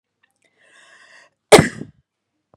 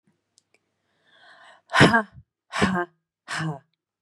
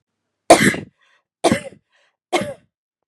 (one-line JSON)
{"cough_length": "2.6 s", "cough_amplitude": 32768, "cough_signal_mean_std_ratio": 0.19, "exhalation_length": "4.0 s", "exhalation_amplitude": 29794, "exhalation_signal_mean_std_ratio": 0.31, "three_cough_length": "3.1 s", "three_cough_amplitude": 32768, "three_cough_signal_mean_std_ratio": 0.3, "survey_phase": "beta (2021-08-13 to 2022-03-07)", "age": "18-44", "gender": "Female", "wearing_mask": "No", "symptom_none": true, "smoker_status": "Ex-smoker", "respiratory_condition_asthma": false, "respiratory_condition_other": false, "recruitment_source": "REACT", "submission_delay": "1 day", "covid_test_result": "Negative", "covid_test_method": "RT-qPCR", "influenza_a_test_result": "Unknown/Void", "influenza_b_test_result": "Unknown/Void"}